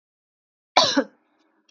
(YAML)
cough_length: 1.7 s
cough_amplitude: 30638
cough_signal_mean_std_ratio: 0.28
survey_phase: beta (2021-08-13 to 2022-03-07)
age: 45-64
gender: Female
wearing_mask: 'No'
symptom_cough_any: true
symptom_runny_or_blocked_nose: true
symptom_onset: 5 days
smoker_status: Never smoked
respiratory_condition_asthma: false
respiratory_condition_other: false
recruitment_source: REACT
submission_delay: 1 day
covid_test_result: Negative
covid_test_method: RT-qPCR
influenza_a_test_result: Negative
influenza_b_test_result: Negative